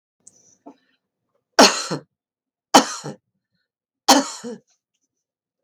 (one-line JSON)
{"three_cough_length": "5.6 s", "three_cough_amplitude": 32768, "three_cough_signal_mean_std_ratio": 0.24, "survey_phase": "beta (2021-08-13 to 2022-03-07)", "age": "65+", "gender": "Female", "wearing_mask": "No", "symptom_none": true, "smoker_status": "Never smoked", "respiratory_condition_asthma": false, "respiratory_condition_other": false, "recruitment_source": "REACT", "submission_delay": "7 days", "covid_test_result": "Negative", "covid_test_method": "RT-qPCR", "influenza_a_test_result": "Negative", "influenza_b_test_result": "Negative"}